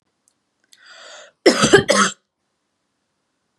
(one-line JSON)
{"cough_length": "3.6 s", "cough_amplitude": 32767, "cough_signal_mean_std_ratio": 0.3, "survey_phase": "beta (2021-08-13 to 2022-03-07)", "age": "18-44", "gender": "Female", "wearing_mask": "No", "symptom_none": true, "smoker_status": "Never smoked", "respiratory_condition_asthma": false, "respiratory_condition_other": false, "recruitment_source": "REACT", "submission_delay": "0 days", "covid_test_result": "Negative", "covid_test_method": "RT-qPCR", "influenza_a_test_result": "Negative", "influenza_b_test_result": "Negative"}